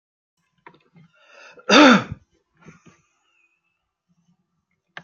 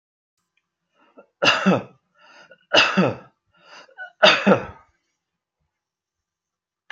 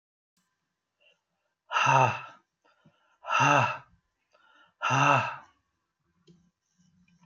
{"cough_length": "5.0 s", "cough_amplitude": 27637, "cough_signal_mean_std_ratio": 0.22, "three_cough_length": "6.9 s", "three_cough_amplitude": 30016, "three_cough_signal_mean_std_ratio": 0.31, "exhalation_length": "7.3 s", "exhalation_amplitude": 15014, "exhalation_signal_mean_std_ratio": 0.35, "survey_phase": "alpha (2021-03-01 to 2021-08-12)", "age": "65+", "gender": "Male", "wearing_mask": "No", "symptom_none": true, "smoker_status": "Ex-smoker", "respiratory_condition_asthma": false, "respiratory_condition_other": false, "recruitment_source": "REACT", "submission_delay": "2 days", "covid_test_result": "Negative", "covid_test_method": "RT-qPCR"}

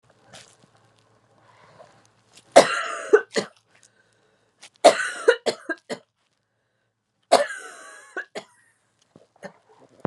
{"three_cough_length": "10.1 s", "three_cough_amplitude": 32768, "three_cough_signal_mean_std_ratio": 0.24, "survey_phase": "beta (2021-08-13 to 2022-03-07)", "age": "18-44", "gender": "Female", "wearing_mask": "No", "symptom_cough_any": true, "symptom_runny_or_blocked_nose": true, "symptom_shortness_of_breath": true, "symptom_sore_throat": true, "symptom_fatigue": true, "smoker_status": "Never smoked", "respiratory_condition_asthma": false, "respiratory_condition_other": false, "recruitment_source": "Test and Trace", "submission_delay": "2 days", "covid_test_result": "Positive", "covid_test_method": "LFT"}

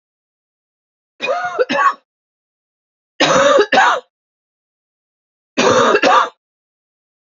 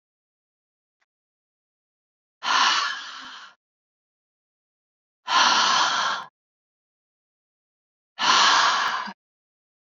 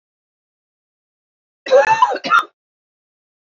{"three_cough_length": "7.3 s", "three_cough_amplitude": 30461, "three_cough_signal_mean_std_ratio": 0.43, "exhalation_length": "9.9 s", "exhalation_amplitude": 17540, "exhalation_signal_mean_std_ratio": 0.4, "cough_length": "3.4 s", "cough_amplitude": 28833, "cough_signal_mean_std_ratio": 0.33, "survey_phase": "beta (2021-08-13 to 2022-03-07)", "age": "18-44", "gender": "Female", "wearing_mask": "No", "symptom_runny_or_blocked_nose": true, "symptom_fatigue": true, "symptom_headache": true, "symptom_onset": "3 days", "smoker_status": "Never smoked", "respiratory_condition_asthma": false, "respiratory_condition_other": false, "recruitment_source": "Test and Trace", "submission_delay": "2 days", "covid_test_result": "Positive", "covid_test_method": "RT-qPCR", "covid_ct_value": 15.9, "covid_ct_gene": "ORF1ab gene", "covid_ct_mean": 16.2, "covid_viral_load": "4900000 copies/ml", "covid_viral_load_category": "High viral load (>1M copies/ml)"}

